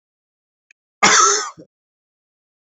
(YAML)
cough_length: 2.7 s
cough_amplitude: 31480
cough_signal_mean_std_ratio: 0.32
survey_phase: beta (2021-08-13 to 2022-03-07)
age: 18-44
gender: Male
wearing_mask: 'No'
symptom_cough_any: true
symptom_runny_or_blocked_nose: true
symptom_fatigue: true
smoker_status: Never smoked
respiratory_condition_asthma: false
respiratory_condition_other: false
recruitment_source: Test and Trace
submission_delay: 2 days
covid_test_result: Positive
covid_test_method: ePCR